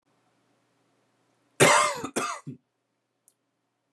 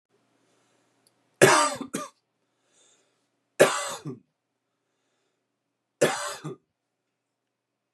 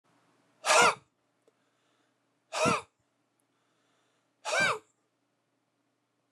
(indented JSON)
{
  "cough_length": "3.9 s",
  "cough_amplitude": 19177,
  "cough_signal_mean_std_ratio": 0.29,
  "three_cough_length": "7.9 s",
  "three_cough_amplitude": 28123,
  "three_cough_signal_mean_std_ratio": 0.25,
  "exhalation_length": "6.3 s",
  "exhalation_amplitude": 11239,
  "exhalation_signal_mean_std_ratio": 0.28,
  "survey_phase": "beta (2021-08-13 to 2022-03-07)",
  "age": "45-64",
  "gender": "Male",
  "wearing_mask": "No",
  "symptom_none": true,
  "smoker_status": "Ex-smoker",
  "respiratory_condition_asthma": false,
  "respiratory_condition_other": false,
  "recruitment_source": "REACT",
  "submission_delay": "2 days",
  "covid_test_result": "Negative",
  "covid_test_method": "RT-qPCR",
  "influenza_a_test_result": "Negative",
  "influenza_b_test_result": "Negative"
}